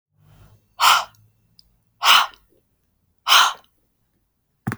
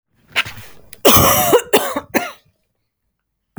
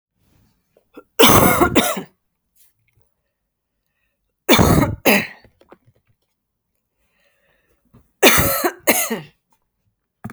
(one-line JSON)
{"exhalation_length": "4.8 s", "exhalation_amplitude": 32119, "exhalation_signal_mean_std_ratio": 0.31, "cough_length": "3.6 s", "cough_amplitude": 32768, "cough_signal_mean_std_ratio": 0.42, "three_cough_length": "10.3 s", "three_cough_amplitude": 32768, "three_cough_signal_mean_std_ratio": 0.35, "survey_phase": "beta (2021-08-13 to 2022-03-07)", "age": "45-64", "gender": "Female", "wearing_mask": "No", "symptom_none": true, "smoker_status": "Never smoked", "respiratory_condition_asthma": false, "respiratory_condition_other": false, "recruitment_source": "REACT", "submission_delay": "11 days", "covid_test_result": "Negative", "covid_test_method": "RT-qPCR"}